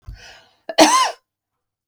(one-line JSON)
{"cough_length": "1.9 s", "cough_amplitude": 32768, "cough_signal_mean_std_ratio": 0.35, "survey_phase": "beta (2021-08-13 to 2022-03-07)", "age": "45-64", "gender": "Female", "wearing_mask": "No", "symptom_none": true, "smoker_status": "Never smoked", "respiratory_condition_asthma": false, "respiratory_condition_other": false, "recruitment_source": "REACT", "submission_delay": "1 day", "covid_test_result": "Negative", "covid_test_method": "RT-qPCR"}